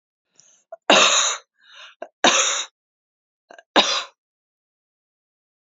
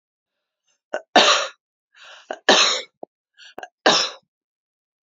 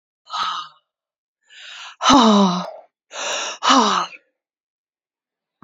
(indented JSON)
{
  "cough_length": "5.7 s",
  "cough_amplitude": 28449,
  "cough_signal_mean_std_ratio": 0.34,
  "three_cough_length": "5.0 s",
  "three_cough_amplitude": 30462,
  "three_cough_signal_mean_std_ratio": 0.33,
  "exhalation_length": "5.6 s",
  "exhalation_amplitude": 30363,
  "exhalation_signal_mean_std_ratio": 0.43,
  "survey_phase": "alpha (2021-03-01 to 2021-08-12)",
  "age": "45-64",
  "gender": "Female",
  "wearing_mask": "No",
  "symptom_none": true,
  "smoker_status": "Ex-smoker",
  "respiratory_condition_asthma": false,
  "respiratory_condition_other": false,
  "recruitment_source": "Test and Trace",
  "submission_delay": "2 days",
  "covid_test_result": "Positive",
  "covid_test_method": "RT-qPCR"
}